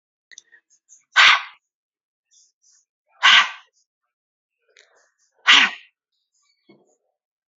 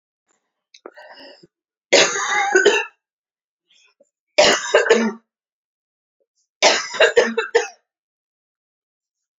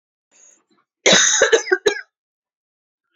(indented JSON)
{
  "exhalation_length": "7.6 s",
  "exhalation_amplitude": 29999,
  "exhalation_signal_mean_std_ratio": 0.24,
  "three_cough_length": "9.4 s",
  "three_cough_amplitude": 32767,
  "three_cough_signal_mean_std_ratio": 0.38,
  "cough_length": "3.2 s",
  "cough_amplitude": 31220,
  "cough_signal_mean_std_ratio": 0.37,
  "survey_phase": "beta (2021-08-13 to 2022-03-07)",
  "age": "45-64",
  "gender": "Female",
  "wearing_mask": "No",
  "symptom_none": true,
  "smoker_status": "Never smoked",
  "respiratory_condition_asthma": false,
  "respiratory_condition_other": false,
  "recruitment_source": "REACT",
  "submission_delay": "2 days",
  "covid_test_result": "Negative",
  "covid_test_method": "RT-qPCR"
}